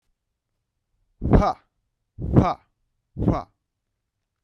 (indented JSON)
{
  "exhalation_length": "4.4 s",
  "exhalation_amplitude": 32768,
  "exhalation_signal_mean_std_ratio": 0.31,
  "survey_phase": "beta (2021-08-13 to 2022-03-07)",
  "age": "18-44",
  "gender": "Male",
  "wearing_mask": "No",
  "symptom_cough_any": true,
  "symptom_new_continuous_cough": true,
  "symptom_sore_throat": true,
  "symptom_fatigue": true,
  "symptom_headache": true,
  "symptom_onset": "3 days",
  "smoker_status": "Never smoked",
  "respiratory_condition_asthma": false,
  "respiratory_condition_other": false,
  "recruitment_source": "Test and Trace",
  "submission_delay": "2 days",
  "covid_test_result": "Positive",
  "covid_test_method": "RT-qPCR"
}